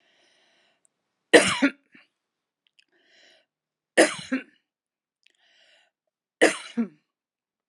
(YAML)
three_cough_length: 7.7 s
three_cough_amplitude: 30807
three_cough_signal_mean_std_ratio: 0.22
survey_phase: beta (2021-08-13 to 2022-03-07)
age: 45-64
gender: Female
wearing_mask: 'No'
symptom_none: true
smoker_status: Never smoked
respiratory_condition_asthma: false
respiratory_condition_other: false
recruitment_source: Test and Trace
submission_delay: 1 day
covid_test_result: Negative
covid_test_method: RT-qPCR